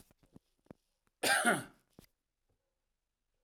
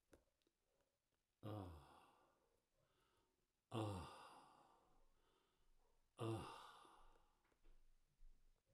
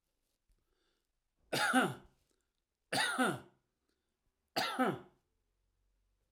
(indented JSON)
{
  "cough_length": "3.4 s",
  "cough_amplitude": 4702,
  "cough_signal_mean_std_ratio": 0.27,
  "exhalation_length": "8.7 s",
  "exhalation_amplitude": 727,
  "exhalation_signal_mean_std_ratio": 0.37,
  "three_cough_length": "6.3 s",
  "three_cough_amplitude": 4116,
  "three_cough_signal_mean_std_ratio": 0.36,
  "survey_phase": "alpha (2021-03-01 to 2021-08-12)",
  "age": "65+",
  "gender": "Male",
  "wearing_mask": "No",
  "symptom_none": true,
  "smoker_status": "Never smoked",
  "respiratory_condition_asthma": false,
  "respiratory_condition_other": false,
  "recruitment_source": "REACT",
  "submission_delay": "1 day",
  "covid_test_result": "Negative",
  "covid_test_method": "RT-qPCR"
}